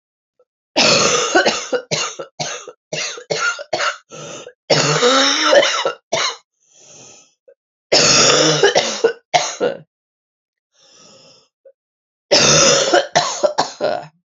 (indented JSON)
{
  "three_cough_length": "14.3 s",
  "three_cough_amplitude": 32768,
  "three_cough_signal_mean_std_ratio": 0.55,
  "survey_phase": "alpha (2021-03-01 to 2021-08-12)",
  "age": "18-44",
  "gender": "Female",
  "wearing_mask": "No",
  "symptom_cough_any": true,
  "symptom_new_continuous_cough": true,
  "symptom_abdominal_pain": true,
  "symptom_fatigue": true,
  "symptom_fever_high_temperature": true,
  "symptom_headache": true,
  "symptom_onset": "2 days",
  "smoker_status": "Never smoked",
  "respiratory_condition_asthma": false,
  "respiratory_condition_other": false,
  "recruitment_source": "Test and Trace",
  "submission_delay": "1 day",
  "covid_test_result": "Positive",
  "covid_test_method": "RT-qPCR"
}